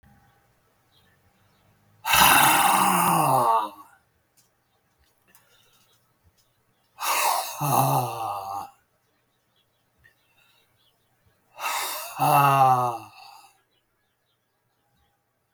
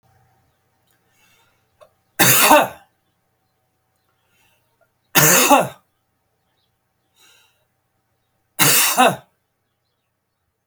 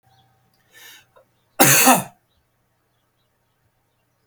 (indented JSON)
{
  "exhalation_length": "15.5 s",
  "exhalation_amplitude": 29026,
  "exhalation_signal_mean_std_ratio": 0.42,
  "three_cough_length": "10.7 s",
  "three_cough_amplitude": 32768,
  "three_cough_signal_mean_std_ratio": 0.3,
  "cough_length": "4.3 s",
  "cough_amplitude": 32768,
  "cough_signal_mean_std_ratio": 0.26,
  "survey_phase": "beta (2021-08-13 to 2022-03-07)",
  "age": "65+",
  "gender": "Male",
  "wearing_mask": "No",
  "symptom_fatigue": true,
  "smoker_status": "Never smoked",
  "respiratory_condition_asthma": false,
  "respiratory_condition_other": false,
  "recruitment_source": "REACT",
  "submission_delay": "1 day",
  "covid_test_result": "Negative",
  "covid_test_method": "RT-qPCR",
  "influenza_a_test_result": "Negative",
  "influenza_b_test_result": "Negative"
}